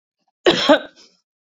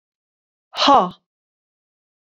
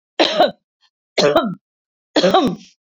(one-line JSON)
{"cough_length": "1.5 s", "cough_amplitude": 30035, "cough_signal_mean_std_ratio": 0.36, "exhalation_length": "2.4 s", "exhalation_amplitude": 26671, "exhalation_signal_mean_std_ratio": 0.27, "three_cough_length": "2.8 s", "three_cough_amplitude": 29193, "three_cough_signal_mean_std_ratio": 0.5, "survey_phase": "beta (2021-08-13 to 2022-03-07)", "age": "45-64", "gender": "Female", "wearing_mask": "No", "symptom_none": true, "smoker_status": "Ex-smoker", "respiratory_condition_asthma": false, "respiratory_condition_other": false, "recruitment_source": "REACT", "submission_delay": "1 day", "covid_test_result": "Negative", "covid_test_method": "RT-qPCR"}